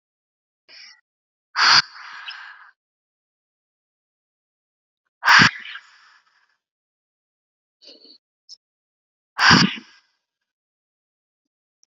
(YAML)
exhalation_length: 11.9 s
exhalation_amplitude: 29678
exhalation_signal_mean_std_ratio: 0.22
survey_phase: beta (2021-08-13 to 2022-03-07)
age: 18-44
gender: Female
wearing_mask: 'No'
symptom_none: true
smoker_status: Never smoked
respiratory_condition_asthma: false
respiratory_condition_other: false
recruitment_source: REACT
submission_delay: 0 days
covid_test_result: Negative
covid_test_method: RT-qPCR
influenza_a_test_result: Negative
influenza_b_test_result: Negative